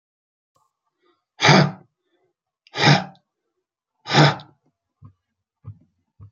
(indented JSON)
{
  "exhalation_length": "6.3 s",
  "exhalation_amplitude": 31880,
  "exhalation_signal_mean_std_ratio": 0.28,
  "survey_phase": "beta (2021-08-13 to 2022-03-07)",
  "age": "45-64",
  "gender": "Male",
  "wearing_mask": "No",
  "symptom_cough_any": true,
  "symptom_runny_or_blocked_nose": true,
  "symptom_shortness_of_breath": true,
  "symptom_sore_throat": true,
  "symptom_abdominal_pain": true,
  "symptom_diarrhoea": true,
  "symptom_fatigue": true,
  "symptom_fever_high_temperature": true,
  "symptom_headache": true,
  "symptom_onset": "12 days",
  "smoker_status": "Current smoker (1 to 10 cigarettes per day)",
  "respiratory_condition_asthma": true,
  "respiratory_condition_other": true,
  "recruitment_source": "REACT",
  "submission_delay": "2 days",
  "covid_test_result": "Negative",
  "covid_test_method": "RT-qPCR",
  "influenza_a_test_result": "Negative",
  "influenza_b_test_result": "Negative"
}